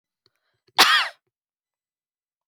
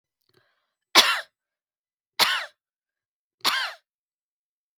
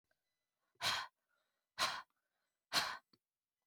{
  "cough_length": "2.5 s",
  "cough_amplitude": 31676,
  "cough_signal_mean_std_ratio": 0.26,
  "three_cough_length": "4.8 s",
  "three_cough_amplitude": 32768,
  "three_cough_signal_mean_std_ratio": 0.27,
  "exhalation_length": "3.7 s",
  "exhalation_amplitude": 3358,
  "exhalation_signal_mean_std_ratio": 0.33,
  "survey_phase": "beta (2021-08-13 to 2022-03-07)",
  "age": "18-44",
  "gender": "Female",
  "wearing_mask": "No",
  "symptom_none": true,
  "smoker_status": "Never smoked",
  "respiratory_condition_asthma": false,
  "respiratory_condition_other": false,
  "recruitment_source": "REACT",
  "submission_delay": "2 days",
  "covid_test_result": "Negative",
  "covid_test_method": "RT-qPCR",
  "influenza_a_test_result": "Negative",
  "influenza_b_test_result": "Negative"
}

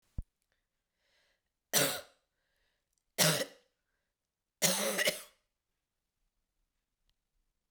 {
  "three_cough_length": "7.7 s",
  "three_cough_amplitude": 9415,
  "three_cough_signal_mean_std_ratio": 0.29,
  "survey_phase": "beta (2021-08-13 to 2022-03-07)",
  "age": "18-44",
  "gender": "Female",
  "wearing_mask": "No",
  "symptom_runny_or_blocked_nose": true,
  "symptom_change_to_sense_of_smell_or_taste": true,
  "symptom_other": true,
  "symptom_onset": "4 days",
  "smoker_status": "Never smoked",
  "respiratory_condition_asthma": false,
  "respiratory_condition_other": false,
  "recruitment_source": "Test and Trace",
  "submission_delay": "2 days",
  "covid_test_result": "Positive",
  "covid_test_method": "RT-qPCR",
  "covid_ct_value": 18.0,
  "covid_ct_gene": "ORF1ab gene",
  "covid_ct_mean": 18.8,
  "covid_viral_load": "680000 copies/ml",
  "covid_viral_load_category": "Low viral load (10K-1M copies/ml)"
}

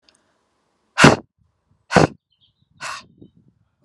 {
  "exhalation_length": "3.8 s",
  "exhalation_amplitude": 32768,
  "exhalation_signal_mean_std_ratio": 0.23,
  "survey_phase": "beta (2021-08-13 to 2022-03-07)",
  "age": "45-64",
  "gender": "Female",
  "wearing_mask": "No",
  "symptom_none": true,
  "smoker_status": "Never smoked",
  "respiratory_condition_asthma": false,
  "respiratory_condition_other": false,
  "recruitment_source": "REACT",
  "submission_delay": "1 day",
  "covid_test_result": "Negative",
  "covid_test_method": "RT-qPCR"
}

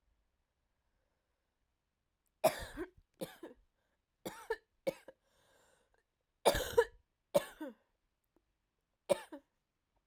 {
  "three_cough_length": "10.1 s",
  "three_cough_amplitude": 6701,
  "three_cough_signal_mean_std_ratio": 0.22,
  "survey_phase": "alpha (2021-03-01 to 2021-08-12)",
  "age": "18-44",
  "gender": "Female",
  "wearing_mask": "No",
  "symptom_cough_any": true,
  "symptom_shortness_of_breath": true,
  "symptom_diarrhoea": true,
  "symptom_fatigue": true,
  "symptom_onset": "7 days",
  "smoker_status": "Never smoked",
  "respiratory_condition_asthma": false,
  "respiratory_condition_other": false,
  "recruitment_source": "Test and Trace",
  "submission_delay": "1 day",
  "covid_test_result": "Positive",
  "covid_test_method": "RT-qPCR",
  "covid_ct_value": 24.0,
  "covid_ct_gene": "ORF1ab gene",
  "covid_ct_mean": 24.5,
  "covid_viral_load": "9200 copies/ml",
  "covid_viral_load_category": "Minimal viral load (< 10K copies/ml)"
}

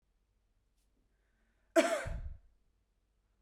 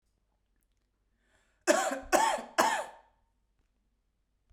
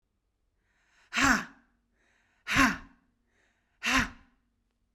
{
  "cough_length": "3.4 s",
  "cough_amplitude": 7179,
  "cough_signal_mean_std_ratio": 0.26,
  "three_cough_length": "4.5 s",
  "three_cough_amplitude": 11555,
  "three_cough_signal_mean_std_ratio": 0.34,
  "exhalation_length": "4.9 s",
  "exhalation_amplitude": 10337,
  "exhalation_signal_mean_std_ratio": 0.31,
  "survey_phase": "beta (2021-08-13 to 2022-03-07)",
  "age": "18-44",
  "gender": "Female",
  "wearing_mask": "No",
  "symptom_cough_any": true,
  "symptom_runny_or_blocked_nose": true,
  "symptom_fatigue": true,
  "symptom_headache": true,
  "symptom_onset": "3 days",
  "smoker_status": "Never smoked",
  "respiratory_condition_asthma": false,
  "respiratory_condition_other": false,
  "recruitment_source": "Test and Trace",
  "submission_delay": "2 days",
  "covid_test_result": "Positive",
  "covid_test_method": "RT-qPCR",
  "covid_ct_value": 28.8,
  "covid_ct_gene": "ORF1ab gene"
}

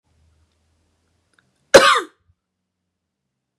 {
  "cough_length": "3.6 s",
  "cough_amplitude": 32768,
  "cough_signal_mean_std_ratio": 0.2,
  "survey_phase": "beta (2021-08-13 to 2022-03-07)",
  "age": "18-44",
  "gender": "Female",
  "wearing_mask": "No",
  "symptom_none": true,
  "smoker_status": "Never smoked",
  "respiratory_condition_asthma": true,
  "respiratory_condition_other": false,
  "recruitment_source": "REACT",
  "submission_delay": "1 day",
  "covid_test_result": "Negative",
  "covid_test_method": "RT-qPCR",
  "influenza_a_test_result": "Unknown/Void",
  "influenza_b_test_result": "Unknown/Void"
}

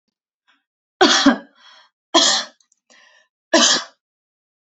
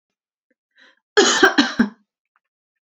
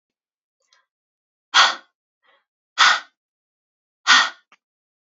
{
  "three_cough_length": "4.8 s",
  "three_cough_amplitude": 30907,
  "three_cough_signal_mean_std_ratio": 0.35,
  "cough_length": "2.9 s",
  "cough_amplitude": 28585,
  "cough_signal_mean_std_ratio": 0.34,
  "exhalation_length": "5.1 s",
  "exhalation_amplitude": 31382,
  "exhalation_signal_mean_std_ratio": 0.26,
  "survey_phase": "beta (2021-08-13 to 2022-03-07)",
  "age": "18-44",
  "gender": "Female",
  "wearing_mask": "No",
  "symptom_none": true,
  "symptom_onset": "13 days",
  "smoker_status": "Never smoked",
  "respiratory_condition_asthma": false,
  "respiratory_condition_other": false,
  "recruitment_source": "REACT",
  "submission_delay": "1 day",
  "covid_test_result": "Negative",
  "covid_test_method": "RT-qPCR"
}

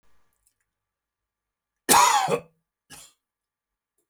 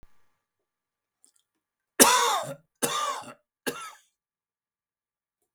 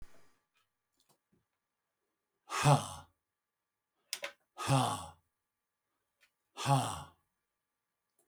{
  "cough_length": "4.1 s",
  "cough_amplitude": 26875,
  "cough_signal_mean_std_ratio": 0.27,
  "three_cough_length": "5.5 s",
  "three_cough_amplitude": 32768,
  "three_cough_signal_mean_std_ratio": 0.29,
  "exhalation_length": "8.3 s",
  "exhalation_amplitude": 6300,
  "exhalation_signal_mean_std_ratio": 0.28,
  "survey_phase": "beta (2021-08-13 to 2022-03-07)",
  "age": "65+",
  "gender": "Male",
  "wearing_mask": "No",
  "symptom_none": true,
  "symptom_onset": "12 days",
  "smoker_status": "Never smoked",
  "respiratory_condition_asthma": false,
  "respiratory_condition_other": false,
  "recruitment_source": "REACT",
  "submission_delay": "4 days",
  "covid_test_result": "Negative",
  "covid_test_method": "RT-qPCR",
  "influenza_a_test_result": "Unknown/Void",
  "influenza_b_test_result": "Unknown/Void"
}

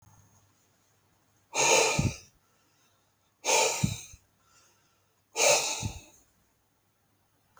{
  "exhalation_length": "7.6 s",
  "exhalation_amplitude": 10078,
  "exhalation_signal_mean_std_ratio": 0.37,
  "survey_phase": "beta (2021-08-13 to 2022-03-07)",
  "age": "18-44",
  "gender": "Male",
  "wearing_mask": "No",
  "symptom_none": true,
  "smoker_status": "Never smoked",
  "respiratory_condition_asthma": false,
  "respiratory_condition_other": false,
  "recruitment_source": "REACT",
  "submission_delay": "2 days",
  "covid_test_result": "Negative",
  "covid_test_method": "RT-qPCR"
}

